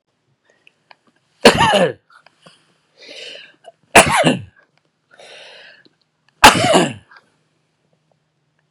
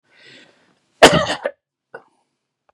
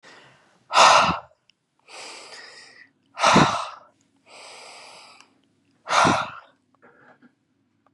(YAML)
three_cough_length: 8.7 s
three_cough_amplitude: 32768
three_cough_signal_mean_std_ratio: 0.3
cough_length: 2.7 s
cough_amplitude: 32768
cough_signal_mean_std_ratio: 0.24
exhalation_length: 7.9 s
exhalation_amplitude: 28827
exhalation_signal_mean_std_ratio: 0.33
survey_phase: beta (2021-08-13 to 2022-03-07)
age: 65+
gender: Male
wearing_mask: 'No'
symptom_none: true
smoker_status: Ex-smoker
respiratory_condition_asthma: false
respiratory_condition_other: false
recruitment_source: REACT
submission_delay: 1 day
covid_test_result: Negative
covid_test_method: RT-qPCR